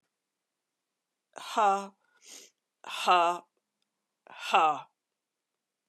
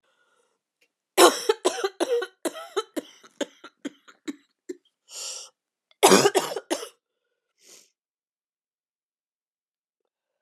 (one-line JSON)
{"exhalation_length": "5.9 s", "exhalation_amplitude": 10969, "exhalation_signal_mean_std_ratio": 0.33, "cough_length": "10.4 s", "cough_amplitude": 30945, "cough_signal_mean_std_ratio": 0.27, "survey_phase": "beta (2021-08-13 to 2022-03-07)", "age": "45-64", "gender": "Female", "wearing_mask": "No", "symptom_cough_any": true, "symptom_new_continuous_cough": true, "symptom_runny_or_blocked_nose": true, "symptom_shortness_of_breath": true, "symptom_sore_throat": true, "symptom_abdominal_pain": true, "symptom_diarrhoea": true, "symptom_fatigue": true, "symptom_fever_high_temperature": true, "symptom_headache": true, "symptom_change_to_sense_of_smell_or_taste": true, "symptom_loss_of_taste": true, "symptom_onset": "5 days", "smoker_status": "Never smoked", "respiratory_condition_asthma": false, "respiratory_condition_other": false, "recruitment_source": "Test and Trace", "submission_delay": "2 days", "covid_test_result": "Positive", "covid_test_method": "RT-qPCR", "covid_ct_value": 17.8, "covid_ct_gene": "S gene", "covid_ct_mean": 18.3, "covid_viral_load": "960000 copies/ml", "covid_viral_load_category": "Low viral load (10K-1M copies/ml)"}